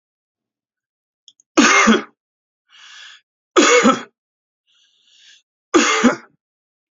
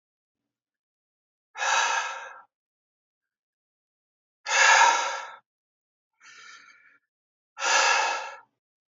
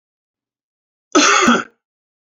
{"three_cough_length": "6.9 s", "three_cough_amplitude": 30996, "three_cough_signal_mean_std_ratio": 0.35, "exhalation_length": "8.9 s", "exhalation_amplitude": 16787, "exhalation_signal_mean_std_ratio": 0.37, "cough_length": "2.4 s", "cough_amplitude": 31068, "cough_signal_mean_std_ratio": 0.37, "survey_phase": "beta (2021-08-13 to 2022-03-07)", "age": "18-44", "gender": "Male", "wearing_mask": "No", "symptom_none": true, "smoker_status": "Ex-smoker", "respiratory_condition_asthma": false, "respiratory_condition_other": false, "recruitment_source": "REACT", "submission_delay": "2 days", "covid_test_result": "Negative", "covid_test_method": "RT-qPCR", "influenza_a_test_result": "Negative", "influenza_b_test_result": "Negative"}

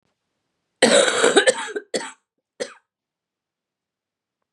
{"cough_length": "4.5 s", "cough_amplitude": 30584, "cough_signal_mean_std_ratio": 0.34, "survey_phase": "beta (2021-08-13 to 2022-03-07)", "age": "45-64", "gender": "Female", "wearing_mask": "No", "symptom_cough_any": true, "symptom_runny_or_blocked_nose": true, "symptom_sore_throat": true, "symptom_change_to_sense_of_smell_or_taste": true, "symptom_loss_of_taste": true, "symptom_onset": "3 days", "smoker_status": "Ex-smoker", "respiratory_condition_asthma": false, "respiratory_condition_other": false, "recruitment_source": "Test and Trace", "submission_delay": "2 days", "covid_test_result": "Positive", "covid_test_method": "RT-qPCR", "covid_ct_value": 16.6, "covid_ct_gene": "ORF1ab gene", "covid_ct_mean": 16.8, "covid_viral_load": "3000000 copies/ml", "covid_viral_load_category": "High viral load (>1M copies/ml)"}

